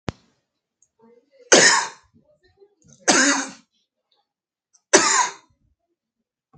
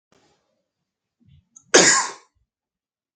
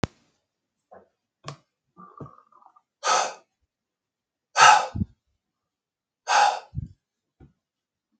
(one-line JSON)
{"three_cough_length": "6.6 s", "three_cough_amplitude": 32768, "three_cough_signal_mean_std_ratio": 0.31, "cough_length": "3.2 s", "cough_amplitude": 32768, "cough_signal_mean_std_ratio": 0.25, "exhalation_length": "8.2 s", "exhalation_amplitude": 31387, "exhalation_signal_mean_std_ratio": 0.26, "survey_phase": "beta (2021-08-13 to 2022-03-07)", "age": "45-64", "gender": "Male", "wearing_mask": "No", "symptom_cough_any": true, "symptom_runny_or_blocked_nose": true, "symptom_sore_throat": true, "symptom_fatigue": true, "symptom_change_to_sense_of_smell_or_taste": true, "symptom_loss_of_taste": true, "symptom_onset": "4 days", "smoker_status": "Never smoked", "respiratory_condition_asthma": false, "respiratory_condition_other": false, "recruitment_source": "Test and Trace", "submission_delay": "3 days", "covid_test_result": "Positive", "covid_test_method": "RT-qPCR"}